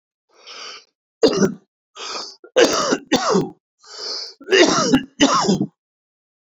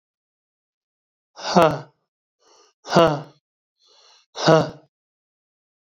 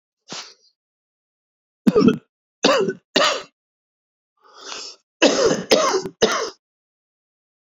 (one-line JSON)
{"three_cough_length": "6.5 s", "three_cough_amplitude": 29071, "three_cough_signal_mean_std_ratio": 0.49, "exhalation_length": "6.0 s", "exhalation_amplitude": 27315, "exhalation_signal_mean_std_ratio": 0.27, "cough_length": "7.8 s", "cough_amplitude": 27787, "cough_signal_mean_std_ratio": 0.39, "survey_phase": "beta (2021-08-13 to 2022-03-07)", "age": "65+", "gender": "Male", "wearing_mask": "No", "symptom_cough_any": true, "symptom_new_continuous_cough": true, "symptom_runny_or_blocked_nose": true, "symptom_shortness_of_breath": true, "symptom_sore_throat": true, "symptom_fatigue": true, "symptom_change_to_sense_of_smell_or_taste": true, "symptom_onset": "4 days", "smoker_status": "Ex-smoker", "respiratory_condition_asthma": false, "respiratory_condition_other": false, "recruitment_source": "Test and Trace", "submission_delay": "2 days", "covid_test_result": "Positive", "covid_test_method": "RT-qPCR", "covid_ct_value": 14.5, "covid_ct_gene": "ORF1ab gene", "covid_ct_mean": 14.8, "covid_viral_load": "14000000 copies/ml", "covid_viral_load_category": "High viral load (>1M copies/ml)"}